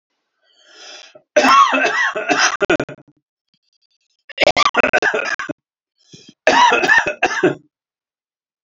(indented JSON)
{
  "three_cough_length": "8.6 s",
  "three_cough_amplitude": 32768,
  "three_cough_signal_mean_std_ratio": 0.47,
  "survey_phase": "alpha (2021-03-01 to 2021-08-12)",
  "age": "65+",
  "gender": "Male",
  "wearing_mask": "No",
  "symptom_none": true,
  "smoker_status": "Never smoked",
  "respiratory_condition_asthma": false,
  "respiratory_condition_other": false,
  "recruitment_source": "REACT",
  "submission_delay": "1 day",
  "covid_test_result": "Negative",
  "covid_test_method": "RT-qPCR"
}